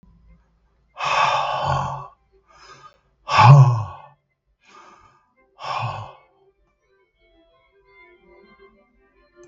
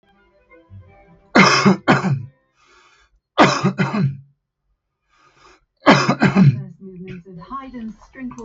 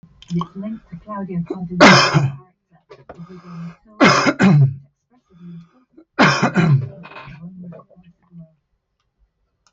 {"exhalation_length": "9.5 s", "exhalation_amplitude": 32768, "exhalation_signal_mean_std_ratio": 0.3, "cough_length": "8.4 s", "cough_amplitude": 32768, "cough_signal_mean_std_ratio": 0.42, "three_cough_length": "9.7 s", "three_cough_amplitude": 32768, "three_cough_signal_mean_std_ratio": 0.43, "survey_phase": "beta (2021-08-13 to 2022-03-07)", "age": "65+", "gender": "Male", "wearing_mask": "No", "symptom_fatigue": true, "symptom_onset": "7 days", "smoker_status": "Ex-smoker", "respiratory_condition_asthma": false, "respiratory_condition_other": false, "recruitment_source": "REACT", "submission_delay": "2 days", "covid_test_result": "Negative", "covid_test_method": "RT-qPCR", "influenza_a_test_result": "Negative", "influenza_b_test_result": "Negative"}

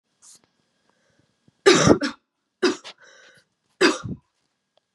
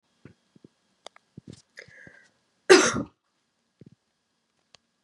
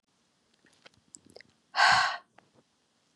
{"three_cough_length": "4.9 s", "three_cough_amplitude": 30882, "three_cough_signal_mean_std_ratio": 0.29, "cough_length": "5.0 s", "cough_amplitude": 31274, "cough_signal_mean_std_ratio": 0.18, "exhalation_length": "3.2 s", "exhalation_amplitude": 11600, "exhalation_signal_mean_std_ratio": 0.28, "survey_phase": "beta (2021-08-13 to 2022-03-07)", "age": "18-44", "gender": "Female", "wearing_mask": "No", "symptom_cough_any": true, "symptom_runny_or_blocked_nose": true, "symptom_shortness_of_breath": true, "symptom_sore_throat": true, "symptom_fatigue": true, "symptom_headache": true, "smoker_status": "Never smoked", "respiratory_condition_asthma": false, "respiratory_condition_other": false, "recruitment_source": "Test and Trace", "submission_delay": "1 day", "covid_test_result": "Positive", "covid_test_method": "RT-qPCR"}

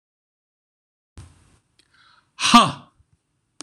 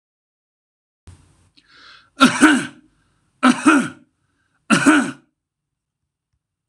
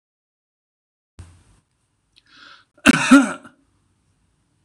{"exhalation_length": "3.6 s", "exhalation_amplitude": 26028, "exhalation_signal_mean_std_ratio": 0.21, "three_cough_length": "6.7 s", "three_cough_amplitude": 26028, "three_cough_signal_mean_std_ratio": 0.32, "cough_length": "4.6 s", "cough_amplitude": 26028, "cough_signal_mean_std_ratio": 0.22, "survey_phase": "alpha (2021-03-01 to 2021-08-12)", "age": "45-64", "gender": "Male", "wearing_mask": "No", "symptom_none": true, "smoker_status": "Ex-smoker", "respiratory_condition_asthma": true, "respiratory_condition_other": false, "recruitment_source": "REACT", "submission_delay": "1 day", "covid_test_result": "Negative", "covid_test_method": "RT-qPCR"}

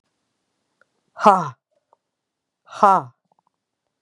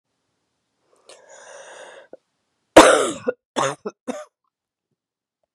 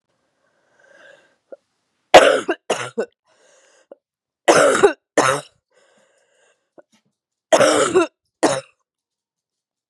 {"exhalation_length": "4.0 s", "exhalation_amplitude": 32767, "exhalation_signal_mean_std_ratio": 0.23, "cough_length": "5.5 s", "cough_amplitude": 32768, "cough_signal_mean_std_ratio": 0.23, "three_cough_length": "9.9 s", "three_cough_amplitude": 32768, "three_cough_signal_mean_std_ratio": 0.32, "survey_phase": "beta (2021-08-13 to 2022-03-07)", "age": "45-64", "gender": "Female", "wearing_mask": "No", "symptom_cough_any": true, "symptom_new_continuous_cough": true, "symptom_runny_or_blocked_nose": true, "symptom_fatigue": true, "symptom_fever_high_temperature": true, "symptom_onset": "3 days", "smoker_status": "Ex-smoker", "respiratory_condition_asthma": false, "respiratory_condition_other": false, "recruitment_source": "Test and Trace", "submission_delay": "2 days", "covid_test_result": "Positive", "covid_test_method": "RT-qPCR", "covid_ct_value": 21.0, "covid_ct_gene": "ORF1ab gene", "covid_ct_mean": 21.4, "covid_viral_load": "95000 copies/ml", "covid_viral_load_category": "Low viral load (10K-1M copies/ml)"}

